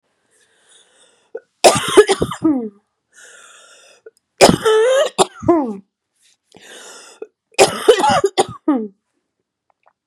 {"three_cough_length": "10.1 s", "three_cough_amplitude": 32768, "three_cough_signal_mean_std_ratio": 0.39, "survey_phase": "beta (2021-08-13 to 2022-03-07)", "age": "18-44", "gender": "Female", "wearing_mask": "No", "symptom_cough_any": true, "symptom_new_continuous_cough": true, "symptom_runny_or_blocked_nose": true, "symptom_shortness_of_breath": true, "symptom_fatigue": true, "symptom_headache": true, "symptom_other": true, "symptom_onset": "3 days", "smoker_status": "Never smoked", "respiratory_condition_asthma": false, "respiratory_condition_other": false, "recruitment_source": "Test and Trace", "submission_delay": "2 days", "covid_test_result": "Positive", "covid_test_method": "RT-qPCR", "covid_ct_value": 30.9, "covid_ct_gene": "ORF1ab gene", "covid_ct_mean": 31.7, "covid_viral_load": "39 copies/ml", "covid_viral_load_category": "Minimal viral load (< 10K copies/ml)"}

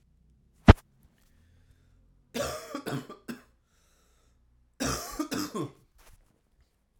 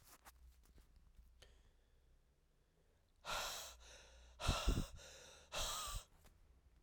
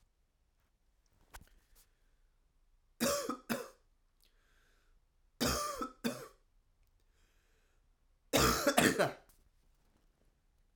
{"cough_length": "7.0 s", "cough_amplitude": 32768, "cough_signal_mean_std_ratio": 0.19, "exhalation_length": "6.8 s", "exhalation_amplitude": 2102, "exhalation_signal_mean_std_ratio": 0.41, "three_cough_length": "10.8 s", "three_cough_amplitude": 9080, "three_cough_signal_mean_std_ratio": 0.32, "survey_phase": "alpha (2021-03-01 to 2021-08-12)", "age": "18-44", "gender": "Male", "wearing_mask": "No", "symptom_cough_any": true, "symptom_fatigue": true, "symptom_headache": true, "symptom_change_to_sense_of_smell_or_taste": true, "symptom_loss_of_taste": true, "smoker_status": "Never smoked", "respiratory_condition_asthma": false, "respiratory_condition_other": false, "recruitment_source": "Test and Trace", "submission_delay": "1 day", "covid_test_result": "Positive", "covid_test_method": "RT-qPCR"}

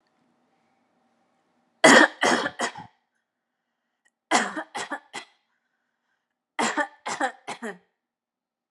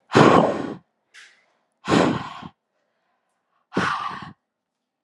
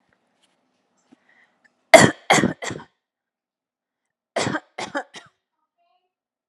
{"three_cough_length": "8.7 s", "three_cough_amplitude": 27450, "three_cough_signal_mean_std_ratio": 0.28, "exhalation_length": "5.0 s", "exhalation_amplitude": 30249, "exhalation_signal_mean_std_ratio": 0.37, "cough_length": "6.5 s", "cough_amplitude": 32768, "cough_signal_mean_std_ratio": 0.21, "survey_phase": "alpha (2021-03-01 to 2021-08-12)", "age": "18-44", "gender": "Female", "wearing_mask": "No", "symptom_none": true, "smoker_status": "Never smoked", "respiratory_condition_asthma": false, "respiratory_condition_other": false, "recruitment_source": "REACT", "submission_delay": "3 days", "covid_test_result": "Negative", "covid_test_method": "RT-qPCR"}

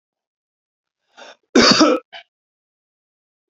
{"cough_length": "3.5 s", "cough_amplitude": 31276, "cough_signal_mean_std_ratio": 0.29, "survey_phase": "beta (2021-08-13 to 2022-03-07)", "age": "18-44", "gender": "Male", "wearing_mask": "No", "symptom_none": true, "smoker_status": "Never smoked", "respiratory_condition_asthma": false, "respiratory_condition_other": false, "recruitment_source": "REACT", "submission_delay": "0 days", "covid_test_result": "Negative", "covid_test_method": "RT-qPCR"}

